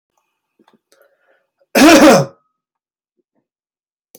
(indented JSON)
{
  "cough_length": "4.2 s",
  "cough_amplitude": 32768,
  "cough_signal_mean_std_ratio": 0.31,
  "survey_phase": "beta (2021-08-13 to 2022-03-07)",
  "age": "45-64",
  "gender": "Male",
  "wearing_mask": "No",
  "symptom_none": true,
  "smoker_status": "Never smoked",
  "respiratory_condition_asthma": false,
  "respiratory_condition_other": false,
  "recruitment_source": "REACT",
  "submission_delay": "2 days",
  "covid_test_result": "Negative",
  "covid_test_method": "RT-qPCR",
  "influenza_a_test_result": "Negative",
  "influenza_b_test_result": "Negative"
}